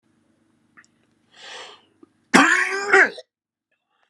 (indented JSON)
{
  "cough_length": "4.1 s",
  "cough_amplitude": 32767,
  "cough_signal_mean_std_ratio": 0.32,
  "survey_phase": "alpha (2021-03-01 to 2021-08-12)",
  "age": "18-44",
  "gender": "Male",
  "wearing_mask": "No",
  "symptom_cough_any": true,
  "symptom_new_continuous_cough": true,
  "symptom_onset": "2 days",
  "smoker_status": "Ex-smoker",
  "respiratory_condition_asthma": true,
  "respiratory_condition_other": false,
  "recruitment_source": "Test and Trace",
  "submission_delay": "2 days",
  "covid_test_result": "Positive",
  "covid_test_method": "RT-qPCR",
  "covid_ct_value": 19.7,
  "covid_ct_gene": "N gene",
  "covid_ct_mean": 20.3,
  "covid_viral_load": "230000 copies/ml",
  "covid_viral_load_category": "Low viral load (10K-1M copies/ml)"
}